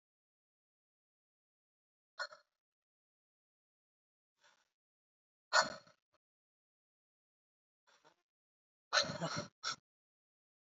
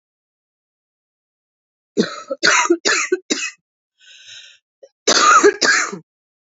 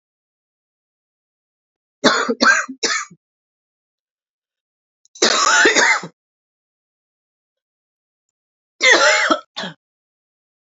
{"exhalation_length": "10.7 s", "exhalation_amplitude": 5877, "exhalation_signal_mean_std_ratio": 0.18, "cough_length": "6.6 s", "cough_amplitude": 32768, "cough_signal_mean_std_ratio": 0.4, "three_cough_length": "10.8 s", "three_cough_amplitude": 32768, "three_cough_signal_mean_std_ratio": 0.35, "survey_phase": "beta (2021-08-13 to 2022-03-07)", "age": "45-64", "gender": "Female", "wearing_mask": "No", "symptom_cough_any": true, "symptom_runny_or_blocked_nose": true, "symptom_sore_throat": true, "symptom_fatigue": true, "symptom_headache": true, "symptom_change_to_sense_of_smell_or_taste": true, "symptom_loss_of_taste": true, "symptom_onset": "3 days", "smoker_status": "Ex-smoker", "respiratory_condition_asthma": false, "respiratory_condition_other": false, "recruitment_source": "Test and Trace", "submission_delay": "2 days", "covid_test_method": "RT-qPCR", "covid_ct_value": 35.9, "covid_ct_gene": "ORF1ab gene"}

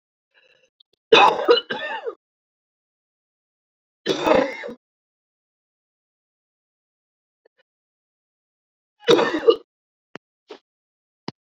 {"cough_length": "11.5 s", "cough_amplitude": 30318, "cough_signal_mean_std_ratio": 0.26, "survey_phase": "beta (2021-08-13 to 2022-03-07)", "age": "18-44", "gender": "Female", "wearing_mask": "No", "symptom_shortness_of_breath": true, "symptom_abdominal_pain": true, "symptom_headache": true, "symptom_onset": "12 days", "smoker_status": "Ex-smoker", "respiratory_condition_asthma": true, "respiratory_condition_other": false, "recruitment_source": "REACT", "submission_delay": "6 days", "covid_test_result": "Negative", "covid_test_method": "RT-qPCR"}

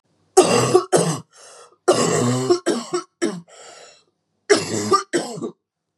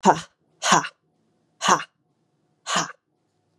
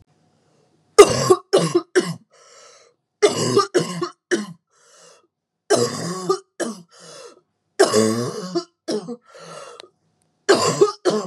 {"cough_length": "6.0 s", "cough_amplitude": 32767, "cough_signal_mean_std_ratio": 0.53, "exhalation_length": "3.6 s", "exhalation_amplitude": 31415, "exhalation_signal_mean_std_ratio": 0.32, "three_cough_length": "11.3 s", "three_cough_amplitude": 32768, "three_cough_signal_mean_std_ratio": 0.41, "survey_phase": "beta (2021-08-13 to 2022-03-07)", "age": "18-44", "gender": "Female", "wearing_mask": "No", "symptom_cough_any": true, "symptom_runny_or_blocked_nose": true, "symptom_sore_throat": true, "symptom_diarrhoea": true, "symptom_fatigue": true, "symptom_headache": true, "symptom_change_to_sense_of_smell_or_taste": true, "symptom_other": true, "symptom_onset": "3 days", "smoker_status": "Never smoked", "respiratory_condition_asthma": false, "respiratory_condition_other": false, "recruitment_source": "Test and Trace", "submission_delay": "2 days", "covid_test_result": "Positive", "covid_test_method": "RT-qPCR", "covid_ct_value": 18.6, "covid_ct_gene": "ORF1ab gene", "covid_ct_mean": 19.7, "covid_viral_load": "350000 copies/ml", "covid_viral_load_category": "Low viral load (10K-1M copies/ml)"}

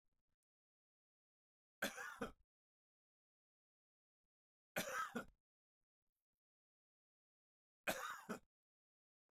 {"three_cough_length": "9.4 s", "three_cough_amplitude": 1391, "three_cough_signal_mean_std_ratio": 0.26, "survey_phase": "beta (2021-08-13 to 2022-03-07)", "age": "45-64", "gender": "Male", "wearing_mask": "No", "symptom_none": true, "smoker_status": "Ex-smoker", "respiratory_condition_asthma": false, "respiratory_condition_other": false, "recruitment_source": "REACT", "submission_delay": "2 days", "covid_test_result": "Negative", "covid_test_method": "RT-qPCR", "influenza_a_test_result": "Negative", "influenza_b_test_result": "Negative"}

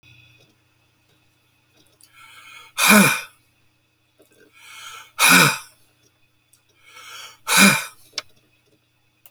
{"exhalation_length": "9.3 s", "exhalation_amplitude": 32767, "exhalation_signal_mean_std_ratio": 0.29, "survey_phase": "beta (2021-08-13 to 2022-03-07)", "age": "65+", "gender": "Male", "wearing_mask": "No", "symptom_cough_any": true, "smoker_status": "Ex-smoker", "respiratory_condition_asthma": true, "respiratory_condition_other": false, "recruitment_source": "REACT", "submission_delay": "1 day", "covid_test_result": "Negative", "covid_test_method": "RT-qPCR"}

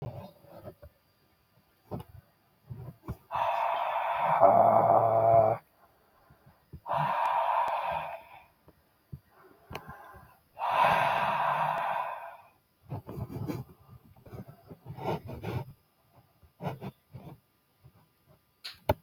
{"exhalation_length": "19.0 s", "exhalation_amplitude": 14561, "exhalation_signal_mean_std_ratio": 0.48, "survey_phase": "beta (2021-08-13 to 2022-03-07)", "age": "65+", "gender": "Male", "wearing_mask": "No", "symptom_abdominal_pain": true, "smoker_status": "Ex-smoker", "respiratory_condition_asthma": false, "respiratory_condition_other": false, "recruitment_source": "REACT", "submission_delay": "8 days", "covid_test_result": "Negative", "covid_test_method": "RT-qPCR", "influenza_a_test_result": "Negative", "influenza_b_test_result": "Negative"}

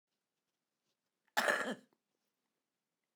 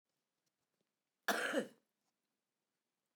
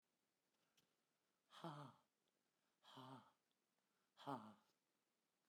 {"cough_length": "3.2 s", "cough_amplitude": 4512, "cough_signal_mean_std_ratio": 0.25, "three_cough_length": "3.2 s", "three_cough_amplitude": 2390, "three_cough_signal_mean_std_ratio": 0.27, "exhalation_length": "5.5 s", "exhalation_amplitude": 435, "exhalation_signal_mean_std_ratio": 0.34, "survey_phase": "beta (2021-08-13 to 2022-03-07)", "age": "65+", "gender": "Female", "wearing_mask": "No", "symptom_cough_any": true, "symptom_runny_or_blocked_nose": true, "symptom_fatigue": true, "symptom_change_to_sense_of_smell_or_taste": true, "symptom_onset": "12 days", "smoker_status": "Ex-smoker", "respiratory_condition_asthma": false, "respiratory_condition_other": true, "recruitment_source": "REACT", "submission_delay": "2 days", "covid_test_result": "Negative", "covid_test_method": "RT-qPCR"}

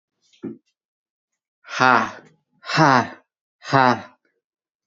{"exhalation_length": "4.9 s", "exhalation_amplitude": 27977, "exhalation_signal_mean_std_ratio": 0.32, "survey_phase": "beta (2021-08-13 to 2022-03-07)", "age": "18-44", "gender": "Male", "wearing_mask": "No", "symptom_cough_any": true, "symptom_runny_or_blocked_nose": true, "symptom_change_to_sense_of_smell_or_taste": true, "symptom_loss_of_taste": true, "symptom_onset": "7 days", "smoker_status": "Never smoked", "respiratory_condition_asthma": false, "respiratory_condition_other": false, "recruitment_source": "REACT", "submission_delay": "0 days", "covid_test_result": "Positive", "covid_test_method": "RT-qPCR", "covid_ct_value": 29.0, "covid_ct_gene": "E gene"}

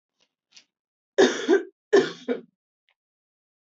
{"cough_length": "3.7 s", "cough_amplitude": 16443, "cough_signal_mean_std_ratio": 0.31, "survey_phase": "beta (2021-08-13 to 2022-03-07)", "age": "18-44", "gender": "Female", "wearing_mask": "No", "symptom_cough_any": true, "symptom_runny_or_blocked_nose": true, "symptom_sore_throat": true, "symptom_fatigue": true, "symptom_headache": true, "smoker_status": "Never smoked", "respiratory_condition_asthma": false, "respiratory_condition_other": false, "recruitment_source": "Test and Trace", "submission_delay": "2 days", "covid_test_result": "Positive", "covid_test_method": "RT-qPCR"}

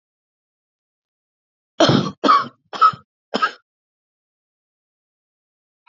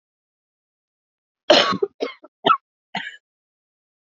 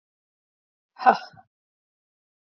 {"three_cough_length": "5.9 s", "three_cough_amplitude": 28900, "three_cough_signal_mean_std_ratio": 0.28, "cough_length": "4.2 s", "cough_amplitude": 29124, "cough_signal_mean_std_ratio": 0.26, "exhalation_length": "2.6 s", "exhalation_amplitude": 26206, "exhalation_signal_mean_std_ratio": 0.17, "survey_phase": "alpha (2021-03-01 to 2021-08-12)", "age": "18-44", "gender": "Female", "wearing_mask": "No", "symptom_cough_any": true, "symptom_fatigue": true, "symptom_change_to_sense_of_smell_or_taste": true, "symptom_onset": "3 days", "smoker_status": "Never smoked", "respiratory_condition_asthma": false, "respiratory_condition_other": false, "recruitment_source": "Test and Trace", "submission_delay": "2 days", "covid_test_result": "Positive", "covid_test_method": "RT-qPCR", "covid_ct_value": 14.9, "covid_ct_gene": "ORF1ab gene", "covid_ct_mean": 16.0, "covid_viral_load": "5700000 copies/ml", "covid_viral_load_category": "High viral load (>1M copies/ml)"}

